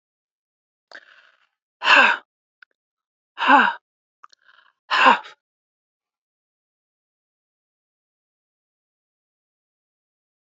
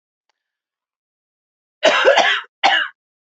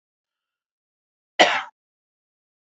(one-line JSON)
{"exhalation_length": "10.6 s", "exhalation_amplitude": 28902, "exhalation_signal_mean_std_ratio": 0.23, "three_cough_length": "3.3 s", "three_cough_amplitude": 32767, "three_cough_signal_mean_std_ratio": 0.39, "cough_length": "2.7 s", "cough_amplitude": 28082, "cough_signal_mean_std_ratio": 0.2, "survey_phase": "beta (2021-08-13 to 2022-03-07)", "age": "45-64", "gender": "Female", "wearing_mask": "No", "symptom_cough_any": true, "symptom_onset": "6 days", "smoker_status": "Never smoked", "respiratory_condition_asthma": true, "respiratory_condition_other": false, "recruitment_source": "REACT", "submission_delay": "14 days", "covid_test_result": "Negative", "covid_test_method": "RT-qPCR"}